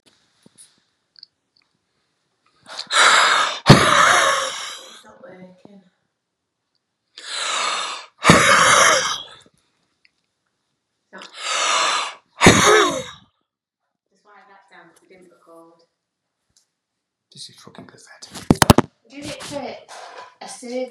{"exhalation_length": "20.9 s", "exhalation_amplitude": 32768, "exhalation_signal_mean_std_ratio": 0.37, "survey_phase": "beta (2021-08-13 to 2022-03-07)", "age": "45-64", "gender": "Male", "wearing_mask": "No", "symptom_cough_any": true, "symptom_runny_or_blocked_nose": true, "symptom_fatigue": true, "symptom_headache": true, "smoker_status": "Never smoked", "respiratory_condition_asthma": true, "respiratory_condition_other": false, "recruitment_source": "Test and Trace", "submission_delay": "3 days", "covid_test_result": "Positive", "covid_test_method": "RT-qPCR", "covid_ct_value": 25.6, "covid_ct_gene": "S gene", "covid_ct_mean": 26.3, "covid_viral_load": "2400 copies/ml", "covid_viral_load_category": "Minimal viral load (< 10K copies/ml)"}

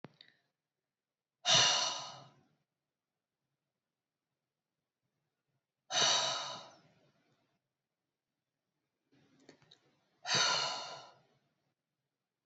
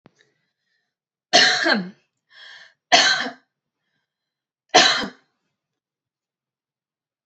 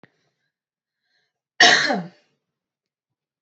{"exhalation_length": "12.5 s", "exhalation_amplitude": 6050, "exhalation_signal_mean_std_ratio": 0.3, "three_cough_length": "7.3 s", "three_cough_amplitude": 29946, "three_cough_signal_mean_std_ratio": 0.31, "cough_length": "3.4 s", "cough_amplitude": 30328, "cough_signal_mean_std_ratio": 0.25, "survey_phase": "beta (2021-08-13 to 2022-03-07)", "age": "18-44", "gender": "Female", "wearing_mask": "No", "symptom_none": true, "smoker_status": "Never smoked", "respiratory_condition_asthma": false, "respiratory_condition_other": false, "recruitment_source": "Test and Trace", "submission_delay": "2 days", "covid_test_result": "Negative", "covid_test_method": "RT-qPCR"}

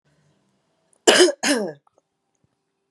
{"cough_length": "2.9 s", "cough_amplitude": 32767, "cough_signal_mean_std_ratio": 0.31, "survey_phase": "beta (2021-08-13 to 2022-03-07)", "age": "18-44", "gender": "Female", "wearing_mask": "No", "symptom_cough_any": true, "symptom_runny_or_blocked_nose": true, "symptom_change_to_sense_of_smell_or_taste": true, "symptom_onset": "4 days", "smoker_status": "Never smoked", "respiratory_condition_asthma": true, "respiratory_condition_other": false, "recruitment_source": "Test and Trace", "submission_delay": "2 days", "covid_test_result": "Positive", "covid_test_method": "RT-qPCR", "covid_ct_value": 23.0, "covid_ct_gene": "N gene"}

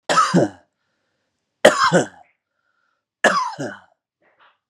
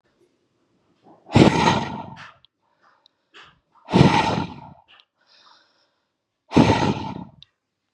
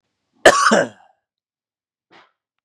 {"three_cough_length": "4.7 s", "three_cough_amplitude": 32768, "three_cough_signal_mean_std_ratio": 0.37, "exhalation_length": "7.9 s", "exhalation_amplitude": 32758, "exhalation_signal_mean_std_ratio": 0.34, "cough_length": "2.6 s", "cough_amplitude": 32768, "cough_signal_mean_std_ratio": 0.29, "survey_phase": "beta (2021-08-13 to 2022-03-07)", "age": "18-44", "gender": "Male", "wearing_mask": "No", "symptom_none": true, "smoker_status": "Never smoked", "respiratory_condition_asthma": false, "respiratory_condition_other": false, "recruitment_source": "REACT", "submission_delay": "1 day", "covid_test_result": "Negative", "covid_test_method": "RT-qPCR", "influenza_a_test_result": "Unknown/Void", "influenza_b_test_result": "Unknown/Void"}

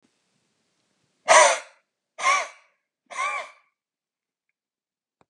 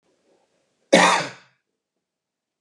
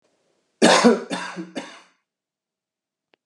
{"exhalation_length": "5.3 s", "exhalation_amplitude": 29394, "exhalation_signal_mean_std_ratio": 0.27, "cough_length": "2.6 s", "cough_amplitude": 31472, "cough_signal_mean_std_ratio": 0.27, "three_cough_length": "3.3 s", "three_cough_amplitude": 31622, "three_cough_signal_mean_std_ratio": 0.32, "survey_phase": "alpha (2021-03-01 to 2021-08-12)", "age": "45-64", "gender": "Male", "wearing_mask": "No", "symptom_none": true, "smoker_status": "Ex-smoker", "respiratory_condition_asthma": false, "respiratory_condition_other": false, "recruitment_source": "REACT", "submission_delay": "3 days", "covid_test_result": "Negative", "covid_test_method": "RT-qPCR"}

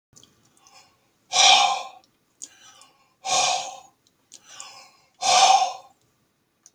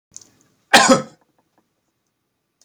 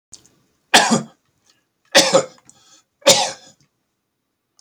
{"exhalation_length": "6.7 s", "exhalation_amplitude": 27916, "exhalation_signal_mean_std_ratio": 0.37, "cough_length": "2.6 s", "cough_amplitude": 31802, "cough_signal_mean_std_ratio": 0.25, "three_cough_length": "4.6 s", "three_cough_amplitude": 32768, "three_cough_signal_mean_std_ratio": 0.31, "survey_phase": "beta (2021-08-13 to 2022-03-07)", "age": "65+", "gender": "Male", "wearing_mask": "No", "symptom_none": true, "smoker_status": "Ex-smoker", "respiratory_condition_asthma": false, "respiratory_condition_other": false, "recruitment_source": "REACT", "submission_delay": "1 day", "covid_test_result": "Negative", "covid_test_method": "RT-qPCR", "influenza_a_test_result": "Unknown/Void", "influenza_b_test_result": "Unknown/Void"}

